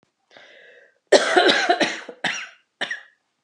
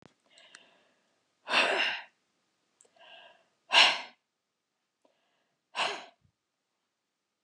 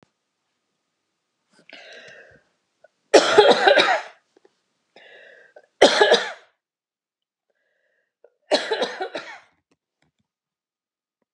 {"cough_length": "3.4 s", "cough_amplitude": 29400, "cough_signal_mean_std_ratio": 0.43, "exhalation_length": "7.4 s", "exhalation_amplitude": 13758, "exhalation_signal_mean_std_ratio": 0.27, "three_cough_length": "11.3 s", "three_cough_amplitude": 32768, "three_cough_signal_mean_std_ratio": 0.29, "survey_phase": "beta (2021-08-13 to 2022-03-07)", "age": "65+", "gender": "Female", "wearing_mask": "No", "symptom_cough_any": true, "smoker_status": "Never smoked", "respiratory_condition_asthma": false, "respiratory_condition_other": true, "recruitment_source": "REACT", "submission_delay": "4 days", "covid_test_result": "Negative", "covid_test_method": "RT-qPCR"}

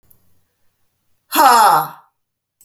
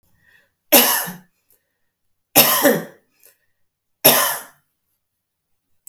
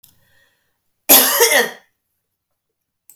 {"exhalation_length": "2.6 s", "exhalation_amplitude": 31944, "exhalation_signal_mean_std_ratio": 0.38, "three_cough_length": "5.9 s", "three_cough_amplitude": 32768, "three_cough_signal_mean_std_ratio": 0.33, "cough_length": "3.2 s", "cough_amplitude": 32768, "cough_signal_mean_std_ratio": 0.33, "survey_phase": "alpha (2021-03-01 to 2021-08-12)", "age": "45-64", "gender": "Female", "wearing_mask": "No", "symptom_none": true, "smoker_status": "Never smoked", "respiratory_condition_asthma": false, "respiratory_condition_other": false, "recruitment_source": "REACT", "submission_delay": "2 days", "covid_test_result": "Negative", "covid_test_method": "RT-qPCR"}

